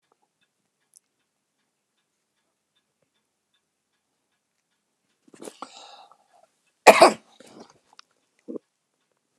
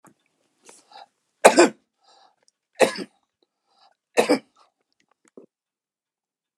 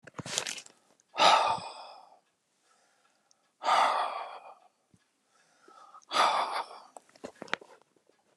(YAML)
cough_length: 9.4 s
cough_amplitude: 32768
cough_signal_mean_std_ratio: 0.13
three_cough_length: 6.6 s
three_cough_amplitude: 32768
three_cough_signal_mean_std_ratio: 0.2
exhalation_length: 8.4 s
exhalation_amplitude: 15277
exhalation_signal_mean_std_ratio: 0.37
survey_phase: alpha (2021-03-01 to 2021-08-12)
age: 65+
gender: Male
wearing_mask: 'No'
symptom_cough_any: true
smoker_status: Never smoked
respiratory_condition_asthma: false
respiratory_condition_other: false
recruitment_source: REACT
submission_delay: 3 days
covid_test_result: Negative
covid_test_method: RT-qPCR